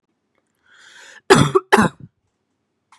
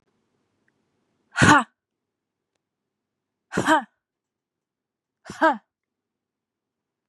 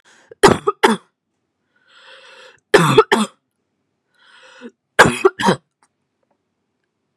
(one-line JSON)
{"cough_length": "3.0 s", "cough_amplitude": 32768, "cough_signal_mean_std_ratio": 0.28, "exhalation_length": "7.1 s", "exhalation_amplitude": 27249, "exhalation_signal_mean_std_ratio": 0.23, "three_cough_length": "7.2 s", "three_cough_amplitude": 32768, "three_cough_signal_mean_std_ratio": 0.29, "survey_phase": "beta (2021-08-13 to 2022-03-07)", "age": "18-44", "gender": "Female", "wearing_mask": "No", "symptom_new_continuous_cough": true, "symptom_runny_or_blocked_nose": true, "symptom_sore_throat": true, "symptom_diarrhoea": true, "symptom_fatigue": true, "symptom_fever_high_temperature": true, "symptom_change_to_sense_of_smell_or_taste": true, "symptom_loss_of_taste": true, "smoker_status": "Never smoked", "respiratory_condition_asthma": false, "respiratory_condition_other": false, "recruitment_source": "Test and Trace", "submission_delay": "1 day", "covid_test_result": "Positive", "covid_test_method": "ePCR"}